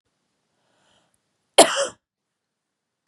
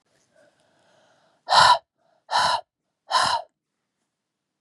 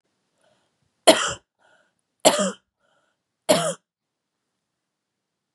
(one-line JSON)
{"cough_length": "3.1 s", "cough_amplitude": 32768, "cough_signal_mean_std_ratio": 0.18, "exhalation_length": "4.6 s", "exhalation_amplitude": 24615, "exhalation_signal_mean_std_ratio": 0.33, "three_cough_length": "5.5 s", "three_cough_amplitude": 32195, "three_cough_signal_mean_std_ratio": 0.24, "survey_phase": "beta (2021-08-13 to 2022-03-07)", "age": "18-44", "gender": "Female", "wearing_mask": "No", "symptom_none": true, "smoker_status": "Never smoked", "respiratory_condition_asthma": false, "respiratory_condition_other": false, "recruitment_source": "REACT", "submission_delay": "1 day", "covid_test_result": "Negative", "covid_test_method": "RT-qPCR", "influenza_a_test_result": "Negative", "influenza_b_test_result": "Negative"}